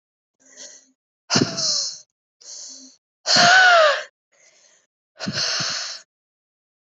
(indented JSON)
{
  "exhalation_length": "7.0 s",
  "exhalation_amplitude": 26485,
  "exhalation_signal_mean_std_ratio": 0.4,
  "survey_phase": "alpha (2021-03-01 to 2021-08-12)",
  "age": "18-44",
  "gender": "Female",
  "wearing_mask": "No",
  "symptom_new_continuous_cough": true,
  "symptom_fever_high_temperature": true,
  "symptom_headache": true,
  "symptom_change_to_sense_of_smell_or_taste": true,
  "symptom_loss_of_taste": true,
  "symptom_onset": "2 days",
  "smoker_status": "Ex-smoker",
  "respiratory_condition_asthma": true,
  "respiratory_condition_other": false,
  "recruitment_source": "Test and Trace",
  "submission_delay": "1 day",
  "covid_test_result": "Positive",
  "covid_test_method": "RT-qPCR",
  "covid_ct_value": 14.9,
  "covid_ct_gene": "ORF1ab gene",
  "covid_ct_mean": 15.3,
  "covid_viral_load": "9600000 copies/ml",
  "covid_viral_load_category": "High viral load (>1M copies/ml)"
}